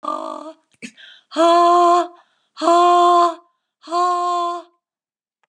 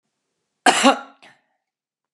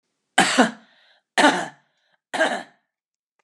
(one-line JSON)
{"exhalation_length": "5.5 s", "exhalation_amplitude": 26383, "exhalation_signal_mean_std_ratio": 0.54, "cough_length": "2.1 s", "cough_amplitude": 32559, "cough_signal_mean_std_ratio": 0.27, "three_cough_length": "3.4 s", "three_cough_amplitude": 31250, "three_cough_signal_mean_std_ratio": 0.36, "survey_phase": "beta (2021-08-13 to 2022-03-07)", "age": "65+", "gender": "Female", "wearing_mask": "No", "symptom_cough_any": true, "smoker_status": "Never smoked", "respiratory_condition_asthma": false, "respiratory_condition_other": false, "recruitment_source": "REACT", "submission_delay": "3 days", "covid_test_result": "Negative", "covid_test_method": "RT-qPCR", "influenza_a_test_result": "Negative", "influenza_b_test_result": "Negative"}